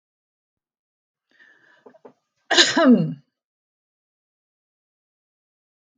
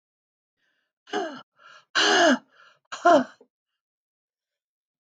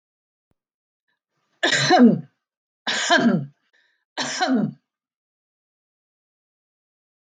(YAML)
cough_length: 6.0 s
cough_amplitude: 31662
cough_signal_mean_std_ratio: 0.24
exhalation_length: 5.0 s
exhalation_amplitude: 18977
exhalation_signal_mean_std_ratio: 0.31
three_cough_length: 7.3 s
three_cough_amplitude: 20986
three_cough_signal_mean_std_ratio: 0.36
survey_phase: beta (2021-08-13 to 2022-03-07)
age: 65+
gender: Female
wearing_mask: 'No'
symptom_none: true
smoker_status: Never smoked
respiratory_condition_asthma: false
respiratory_condition_other: false
recruitment_source: REACT
submission_delay: 2 days
covid_test_result: Negative
covid_test_method: RT-qPCR
influenza_a_test_result: Negative
influenza_b_test_result: Negative